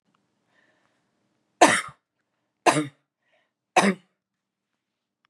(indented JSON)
{
  "three_cough_length": "5.3 s",
  "three_cough_amplitude": 28227,
  "three_cough_signal_mean_std_ratio": 0.23,
  "survey_phase": "beta (2021-08-13 to 2022-03-07)",
  "age": "18-44",
  "gender": "Female",
  "wearing_mask": "No",
  "symptom_none": true,
  "symptom_onset": "13 days",
  "smoker_status": "Never smoked",
  "respiratory_condition_asthma": false,
  "respiratory_condition_other": false,
  "recruitment_source": "REACT",
  "submission_delay": "3 days",
  "covid_test_result": "Negative",
  "covid_test_method": "RT-qPCR",
  "influenza_a_test_result": "Negative",
  "influenza_b_test_result": "Negative"
}